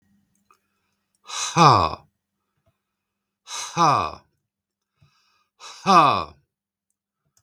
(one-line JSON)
{"exhalation_length": "7.4 s", "exhalation_amplitude": 32416, "exhalation_signal_mean_std_ratio": 0.31, "survey_phase": "beta (2021-08-13 to 2022-03-07)", "age": "65+", "gender": "Male", "wearing_mask": "No", "symptom_cough_any": true, "smoker_status": "Never smoked", "respiratory_condition_asthma": false, "respiratory_condition_other": false, "recruitment_source": "REACT", "submission_delay": "1 day", "covid_test_result": "Negative", "covid_test_method": "RT-qPCR"}